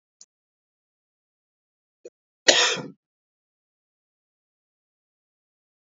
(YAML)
cough_length: 5.8 s
cough_amplitude: 29561
cough_signal_mean_std_ratio: 0.17
survey_phase: beta (2021-08-13 to 2022-03-07)
age: 18-44
gender: Male
wearing_mask: 'No'
symptom_cough_any: true
symptom_runny_or_blocked_nose: true
symptom_fatigue: true
symptom_other: true
symptom_onset: 4 days
smoker_status: Ex-smoker
respiratory_condition_asthma: false
respiratory_condition_other: false
recruitment_source: Test and Trace
submission_delay: 2 days
covid_test_result: Positive
covid_test_method: RT-qPCR
covid_ct_value: 14.2
covid_ct_gene: ORF1ab gene
covid_ct_mean: 14.6
covid_viral_load: 16000000 copies/ml
covid_viral_load_category: High viral load (>1M copies/ml)